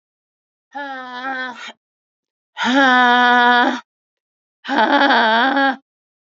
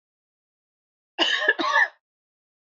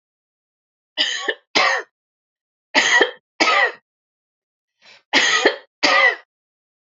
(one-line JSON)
{"exhalation_length": "6.2 s", "exhalation_amplitude": 32767, "exhalation_signal_mean_std_ratio": 0.55, "cough_length": "2.7 s", "cough_amplitude": 16393, "cough_signal_mean_std_ratio": 0.38, "three_cough_length": "6.9 s", "three_cough_amplitude": 30956, "three_cough_signal_mean_std_ratio": 0.43, "survey_phase": "alpha (2021-03-01 to 2021-08-12)", "age": "18-44", "gender": "Female", "wearing_mask": "No", "symptom_fatigue": true, "symptom_headache": true, "smoker_status": "Never smoked", "respiratory_condition_asthma": false, "respiratory_condition_other": false, "recruitment_source": "Test and Trace", "submission_delay": "2 days", "covid_test_result": "Positive", "covid_test_method": "RT-qPCR", "covid_ct_value": 29.2, "covid_ct_gene": "ORF1ab gene", "covid_ct_mean": 30.2, "covid_viral_load": "130 copies/ml", "covid_viral_load_category": "Minimal viral load (< 10K copies/ml)"}